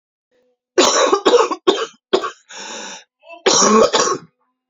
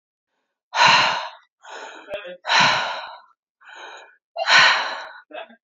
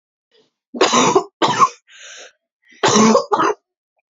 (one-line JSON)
{"cough_length": "4.7 s", "cough_amplitude": 32409, "cough_signal_mean_std_ratio": 0.52, "exhalation_length": "5.6 s", "exhalation_amplitude": 27673, "exhalation_signal_mean_std_ratio": 0.46, "three_cough_length": "4.1 s", "three_cough_amplitude": 32689, "three_cough_signal_mean_std_ratio": 0.48, "survey_phase": "beta (2021-08-13 to 2022-03-07)", "age": "18-44", "gender": "Female", "wearing_mask": "No", "symptom_cough_any": true, "symptom_shortness_of_breath": true, "symptom_sore_throat": true, "symptom_diarrhoea": true, "symptom_fatigue": true, "symptom_headache": true, "symptom_change_to_sense_of_smell_or_taste": true, "symptom_loss_of_taste": true, "symptom_onset": "3 days", "smoker_status": "Ex-smoker", "respiratory_condition_asthma": false, "respiratory_condition_other": false, "recruitment_source": "Test and Trace", "submission_delay": "1 day", "covid_test_result": "Positive", "covid_test_method": "RT-qPCR", "covid_ct_value": 15.8, "covid_ct_gene": "ORF1ab gene", "covid_ct_mean": 16.8, "covid_viral_load": "3100000 copies/ml", "covid_viral_load_category": "High viral load (>1M copies/ml)"}